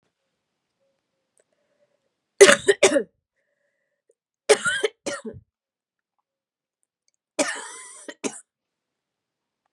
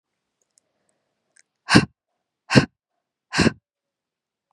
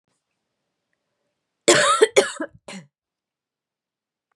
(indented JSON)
{
  "three_cough_length": "9.7 s",
  "three_cough_amplitude": 32767,
  "three_cough_signal_mean_std_ratio": 0.22,
  "exhalation_length": "4.5 s",
  "exhalation_amplitude": 32768,
  "exhalation_signal_mean_std_ratio": 0.21,
  "cough_length": "4.4 s",
  "cough_amplitude": 30139,
  "cough_signal_mean_std_ratio": 0.27,
  "survey_phase": "beta (2021-08-13 to 2022-03-07)",
  "age": "18-44",
  "gender": "Female",
  "wearing_mask": "No",
  "symptom_cough_any": true,
  "symptom_runny_or_blocked_nose": true,
  "symptom_fatigue": true,
  "smoker_status": "Never smoked",
  "respiratory_condition_asthma": false,
  "respiratory_condition_other": false,
  "recruitment_source": "Test and Trace",
  "submission_delay": "1 day",
  "covid_test_result": "Positive",
  "covid_test_method": "RT-qPCR",
  "covid_ct_value": 19.0,
  "covid_ct_gene": "ORF1ab gene"
}